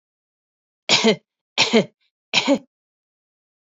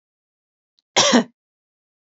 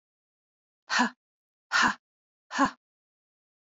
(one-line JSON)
{"three_cough_length": "3.7 s", "three_cough_amplitude": 28807, "three_cough_signal_mean_std_ratio": 0.34, "cough_length": "2.0 s", "cough_amplitude": 27833, "cough_signal_mean_std_ratio": 0.29, "exhalation_length": "3.8 s", "exhalation_amplitude": 9432, "exhalation_signal_mean_std_ratio": 0.3, "survey_phase": "beta (2021-08-13 to 2022-03-07)", "age": "45-64", "gender": "Female", "wearing_mask": "No", "symptom_none": true, "smoker_status": "Never smoked", "respiratory_condition_asthma": true, "respiratory_condition_other": false, "recruitment_source": "REACT", "submission_delay": "3 days", "covid_test_result": "Negative", "covid_test_method": "RT-qPCR", "influenza_a_test_result": "Negative", "influenza_b_test_result": "Negative"}